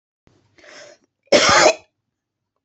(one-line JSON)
{"cough_length": "2.6 s", "cough_amplitude": 28803, "cough_signal_mean_std_ratio": 0.33, "survey_phase": "beta (2021-08-13 to 2022-03-07)", "age": "45-64", "gender": "Female", "wearing_mask": "No", "symptom_none": true, "smoker_status": "Never smoked", "respiratory_condition_asthma": false, "respiratory_condition_other": false, "recruitment_source": "REACT", "submission_delay": "4 days", "covid_test_result": "Negative", "covid_test_method": "RT-qPCR", "influenza_a_test_result": "Negative", "influenza_b_test_result": "Negative"}